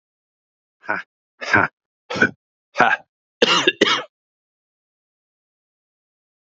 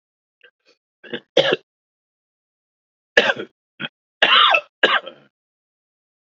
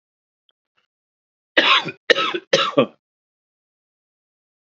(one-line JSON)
{"exhalation_length": "6.6 s", "exhalation_amplitude": 29367, "exhalation_signal_mean_std_ratio": 0.3, "three_cough_length": "6.2 s", "three_cough_amplitude": 28424, "three_cough_signal_mean_std_ratio": 0.3, "cough_length": "4.6 s", "cough_amplitude": 32767, "cough_signal_mean_std_ratio": 0.31, "survey_phase": "beta (2021-08-13 to 2022-03-07)", "age": "45-64", "gender": "Male", "wearing_mask": "No", "symptom_none": true, "smoker_status": "Ex-smoker", "respiratory_condition_asthma": false, "respiratory_condition_other": false, "recruitment_source": "REACT", "submission_delay": "1 day", "covid_test_result": "Negative", "covid_test_method": "RT-qPCR", "influenza_a_test_result": "Negative", "influenza_b_test_result": "Negative"}